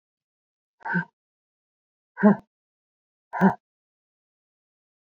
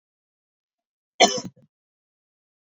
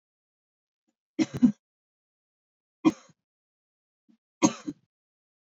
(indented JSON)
{
  "exhalation_length": "5.1 s",
  "exhalation_amplitude": 19734,
  "exhalation_signal_mean_std_ratio": 0.22,
  "cough_length": "2.6 s",
  "cough_amplitude": 30049,
  "cough_signal_mean_std_ratio": 0.18,
  "three_cough_length": "5.5 s",
  "three_cough_amplitude": 13930,
  "three_cough_signal_mean_std_ratio": 0.19,
  "survey_phase": "beta (2021-08-13 to 2022-03-07)",
  "age": "45-64",
  "gender": "Female",
  "wearing_mask": "No",
  "symptom_cough_any": true,
  "symptom_runny_or_blocked_nose": true,
  "symptom_fatigue": true,
  "symptom_change_to_sense_of_smell_or_taste": true,
  "symptom_onset": "6 days",
  "smoker_status": "Never smoked",
  "respiratory_condition_asthma": false,
  "respiratory_condition_other": false,
  "recruitment_source": "Test and Trace",
  "submission_delay": "2 days",
  "covid_test_result": "Positive",
  "covid_test_method": "RT-qPCR"
}